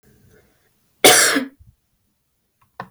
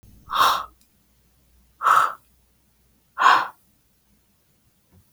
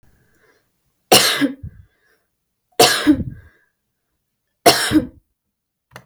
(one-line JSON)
{"cough_length": "2.9 s", "cough_amplitude": 32768, "cough_signal_mean_std_ratio": 0.29, "exhalation_length": "5.1 s", "exhalation_amplitude": 25493, "exhalation_signal_mean_std_ratio": 0.33, "three_cough_length": "6.1 s", "three_cough_amplitude": 32768, "three_cough_signal_mean_std_ratio": 0.33, "survey_phase": "beta (2021-08-13 to 2022-03-07)", "age": "18-44", "gender": "Female", "wearing_mask": "No", "symptom_none": true, "smoker_status": "Never smoked", "respiratory_condition_asthma": false, "respiratory_condition_other": false, "recruitment_source": "REACT", "submission_delay": "1 day", "covid_test_result": "Negative", "covid_test_method": "RT-qPCR", "influenza_a_test_result": "Negative", "influenza_b_test_result": "Negative"}